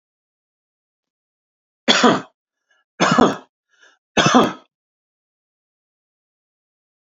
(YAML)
three_cough_length: 7.1 s
three_cough_amplitude: 30074
three_cough_signal_mean_std_ratio: 0.29
survey_phase: beta (2021-08-13 to 2022-03-07)
age: 45-64
gender: Male
wearing_mask: 'No'
symptom_none: true
smoker_status: Never smoked
respiratory_condition_asthma: false
respiratory_condition_other: false
recruitment_source: REACT
submission_delay: 1 day
covid_test_result: Negative
covid_test_method: RT-qPCR
influenza_a_test_result: Negative
influenza_b_test_result: Negative